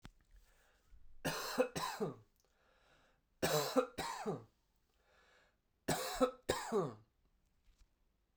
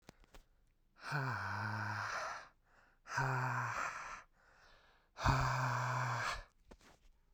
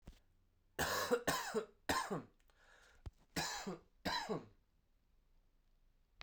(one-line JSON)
{"three_cough_length": "8.4 s", "three_cough_amplitude": 3701, "three_cough_signal_mean_std_ratio": 0.42, "exhalation_length": "7.3 s", "exhalation_amplitude": 3421, "exhalation_signal_mean_std_ratio": 0.64, "cough_length": "6.2 s", "cough_amplitude": 2722, "cough_signal_mean_std_ratio": 0.46, "survey_phase": "beta (2021-08-13 to 2022-03-07)", "age": "18-44", "gender": "Male", "wearing_mask": "No", "symptom_cough_any": true, "symptom_runny_or_blocked_nose": true, "symptom_sore_throat": true, "symptom_fatigue": true, "symptom_headache": true, "symptom_onset": "2 days", "smoker_status": "Never smoked", "respiratory_condition_asthma": false, "respiratory_condition_other": false, "recruitment_source": "Test and Trace", "submission_delay": "1 day", "covid_test_result": "Positive", "covid_test_method": "RT-qPCR", "covid_ct_value": 19.2, "covid_ct_gene": "ORF1ab gene"}